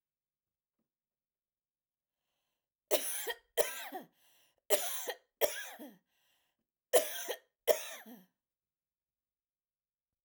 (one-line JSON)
{"cough_length": "10.2 s", "cough_amplitude": 7644, "cough_signal_mean_std_ratio": 0.29, "survey_phase": "alpha (2021-03-01 to 2021-08-12)", "age": "45-64", "gender": "Female", "wearing_mask": "No", "symptom_cough_any": true, "symptom_headache": true, "smoker_status": "Never smoked", "respiratory_condition_asthma": false, "respiratory_condition_other": false, "recruitment_source": "REACT", "submission_delay": "7 days", "covid_test_result": "Negative", "covid_test_method": "RT-qPCR"}